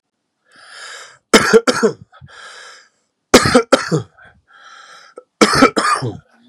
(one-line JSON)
{"three_cough_length": "6.5 s", "three_cough_amplitude": 32768, "three_cough_signal_mean_std_ratio": 0.38, "survey_phase": "beta (2021-08-13 to 2022-03-07)", "age": "45-64", "gender": "Male", "wearing_mask": "No", "symptom_none": true, "smoker_status": "Current smoker (e-cigarettes or vapes only)", "respiratory_condition_asthma": true, "respiratory_condition_other": false, "recruitment_source": "REACT", "submission_delay": "0 days", "covid_test_result": "Negative", "covid_test_method": "RT-qPCR", "influenza_a_test_result": "Negative", "influenza_b_test_result": "Negative"}